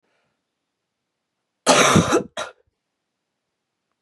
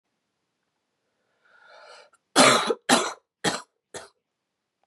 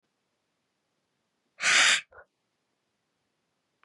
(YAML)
cough_length: 4.0 s
cough_amplitude: 31744
cough_signal_mean_std_ratio: 0.3
three_cough_length: 4.9 s
three_cough_amplitude: 27146
three_cough_signal_mean_std_ratio: 0.29
exhalation_length: 3.8 s
exhalation_amplitude: 12540
exhalation_signal_mean_std_ratio: 0.26
survey_phase: beta (2021-08-13 to 2022-03-07)
age: 18-44
gender: Female
wearing_mask: 'No'
symptom_cough_any: true
symptom_runny_or_blocked_nose: true
symptom_sore_throat: true
symptom_fatigue: true
symptom_headache: true
symptom_change_to_sense_of_smell_or_taste: true
smoker_status: Never smoked
respiratory_condition_asthma: true
respiratory_condition_other: false
recruitment_source: Test and Trace
submission_delay: 2 days
covid_test_result: Positive
covid_test_method: RT-qPCR